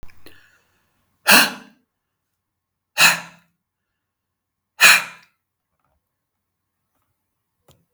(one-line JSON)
{"exhalation_length": "7.9 s", "exhalation_amplitude": 32768, "exhalation_signal_mean_std_ratio": 0.23, "survey_phase": "beta (2021-08-13 to 2022-03-07)", "age": "65+", "gender": "Male", "wearing_mask": "No", "symptom_none": true, "smoker_status": "Never smoked", "respiratory_condition_asthma": false, "respiratory_condition_other": false, "recruitment_source": "REACT", "submission_delay": "3 days", "covid_test_result": "Negative", "covid_test_method": "RT-qPCR", "influenza_a_test_result": "Negative", "influenza_b_test_result": "Negative"}